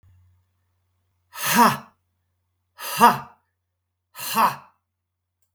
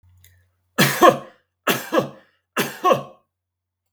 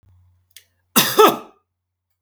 {"exhalation_length": "5.5 s", "exhalation_amplitude": 32627, "exhalation_signal_mean_std_ratio": 0.3, "three_cough_length": "3.9 s", "three_cough_amplitude": 32768, "three_cough_signal_mean_std_ratio": 0.35, "cough_length": "2.2 s", "cough_amplitude": 32768, "cough_signal_mean_std_ratio": 0.31, "survey_phase": "beta (2021-08-13 to 2022-03-07)", "age": "45-64", "gender": "Male", "wearing_mask": "No", "symptom_none": true, "smoker_status": "Never smoked", "respiratory_condition_asthma": false, "respiratory_condition_other": false, "recruitment_source": "REACT", "submission_delay": "9 days", "covid_test_result": "Negative", "covid_test_method": "RT-qPCR", "influenza_a_test_result": "Negative", "influenza_b_test_result": "Negative"}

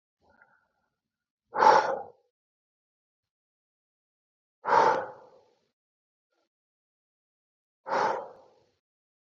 {"exhalation_length": "9.2 s", "exhalation_amplitude": 17956, "exhalation_signal_mean_std_ratio": 0.26, "survey_phase": "alpha (2021-03-01 to 2021-08-12)", "age": "18-44", "gender": "Male", "wearing_mask": "No", "symptom_cough_any": true, "symptom_fatigue": true, "symptom_headache": true, "symptom_change_to_sense_of_smell_or_taste": true, "symptom_loss_of_taste": true, "smoker_status": "Never smoked", "respiratory_condition_asthma": false, "respiratory_condition_other": false, "recruitment_source": "Test and Trace", "submission_delay": "2 days", "covid_test_result": "Positive", "covid_test_method": "RT-qPCR", "covid_ct_value": 13.1, "covid_ct_gene": "ORF1ab gene", "covid_ct_mean": 13.4, "covid_viral_load": "39000000 copies/ml", "covid_viral_load_category": "High viral load (>1M copies/ml)"}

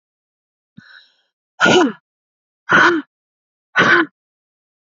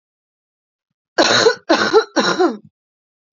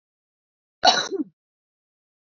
{"exhalation_length": "4.9 s", "exhalation_amplitude": 32768, "exhalation_signal_mean_std_ratio": 0.36, "three_cough_length": "3.3 s", "three_cough_amplitude": 31213, "three_cough_signal_mean_std_ratio": 0.45, "cough_length": "2.2 s", "cough_amplitude": 26618, "cough_signal_mean_std_ratio": 0.26, "survey_phase": "beta (2021-08-13 to 2022-03-07)", "age": "18-44", "gender": "Female", "wearing_mask": "No", "symptom_cough_any": true, "symptom_runny_or_blocked_nose": true, "symptom_headache": true, "symptom_change_to_sense_of_smell_or_taste": true, "symptom_loss_of_taste": true, "symptom_onset": "7 days", "smoker_status": "Current smoker (1 to 10 cigarettes per day)", "respiratory_condition_asthma": false, "respiratory_condition_other": false, "recruitment_source": "Test and Trace", "submission_delay": "1 day", "covid_test_result": "Positive", "covid_test_method": "RT-qPCR", "covid_ct_value": 16.2, "covid_ct_gene": "ORF1ab gene", "covid_ct_mean": 16.5, "covid_viral_load": "3800000 copies/ml", "covid_viral_load_category": "High viral load (>1M copies/ml)"}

